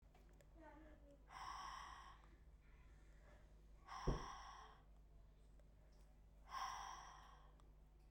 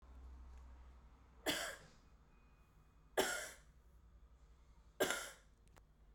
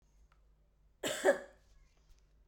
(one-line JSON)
{"exhalation_length": "8.1 s", "exhalation_amplitude": 1107, "exhalation_signal_mean_std_ratio": 0.61, "three_cough_length": "6.1 s", "three_cough_amplitude": 2511, "three_cough_signal_mean_std_ratio": 0.41, "cough_length": "2.5 s", "cough_amplitude": 4618, "cough_signal_mean_std_ratio": 0.28, "survey_phase": "beta (2021-08-13 to 2022-03-07)", "age": "18-44", "gender": "Female", "wearing_mask": "No", "symptom_cough_any": true, "symptom_runny_or_blocked_nose": true, "symptom_fever_high_temperature": true, "symptom_change_to_sense_of_smell_or_taste": true, "symptom_onset": "3 days", "smoker_status": "Never smoked", "respiratory_condition_asthma": false, "respiratory_condition_other": false, "recruitment_source": "Test and Trace", "submission_delay": "1 day", "covid_test_result": "Positive", "covid_test_method": "ePCR"}